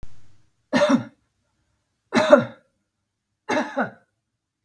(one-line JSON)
{"three_cough_length": "4.6 s", "three_cough_amplitude": 32750, "three_cough_signal_mean_std_ratio": 0.34, "survey_phase": "beta (2021-08-13 to 2022-03-07)", "age": "45-64", "gender": "Female", "wearing_mask": "No", "symptom_none": true, "smoker_status": "Never smoked", "respiratory_condition_asthma": false, "respiratory_condition_other": false, "recruitment_source": "REACT", "submission_delay": "-2 days", "covid_test_result": "Negative", "covid_test_method": "RT-qPCR", "influenza_a_test_result": "Negative", "influenza_b_test_result": "Negative"}